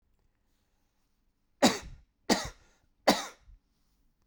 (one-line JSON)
{"three_cough_length": "4.3 s", "three_cough_amplitude": 14233, "three_cough_signal_mean_std_ratio": 0.24, "survey_phase": "beta (2021-08-13 to 2022-03-07)", "age": "18-44", "gender": "Male", "wearing_mask": "No", "symptom_cough_any": true, "symptom_runny_or_blocked_nose": true, "symptom_fatigue": true, "symptom_headache": true, "symptom_change_to_sense_of_smell_or_taste": true, "symptom_loss_of_taste": true, "symptom_onset": "2 days", "smoker_status": "Never smoked", "respiratory_condition_asthma": false, "respiratory_condition_other": false, "recruitment_source": "Test and Trace", "submission_delay": "1 day", "covid_test_result": "Positive", "covid_test_method": "RT-qPCR", "covid_ct_value": 16.1, "covid_ct_gene": "ORF1ab gene", "covid_ct_mean": 16.9, "covid_viral_load": "2900000 copies/ml", "covid_viral_load_category": "High viral load (>1M copies/ml)"}